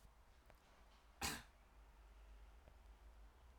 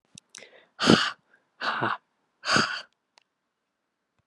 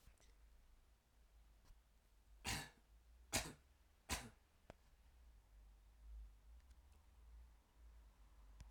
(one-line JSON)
{"cough_length": "3.6 s", "cough_amplitude": 1057, "cough_signal_mean_std_ratio": 0.54, "exhalation_length": "4.3 s", "exhalation_amplitude": 26945, "exhalation_signal_mean_std_ratio": 0.33, "three_cough_length": "8.7 s", "three_cough_amplitude": 1425, "three_cough_signal_mean_std_ratio": 0.44, "survey_phase": "alpha (2021-03-01 to 2021-08-12)", "age": "18-44", "gender": "Male", "wearing_mask": "No", "symptom_fever_high_temperature": true, "symptom_headache": true, "smoker_status": "Never smoked", "respiratory_condition_asthma": false, "respiratory_condition_other": false, "recruitment_source": "Test and Trace", "submission_delay": "2 days", "covid_test_result": "Positive", "covid_test_method": "RT-qPCR", "covid_ct_value": 29.3, "covid_ct_gene": "ORF1ab gene", "covid_ct_mean": 29.9, "covid_viral_load": "160 copies/ml", "covid_viral_load_category": "Minimal viral load (< 10K copies/ml)"}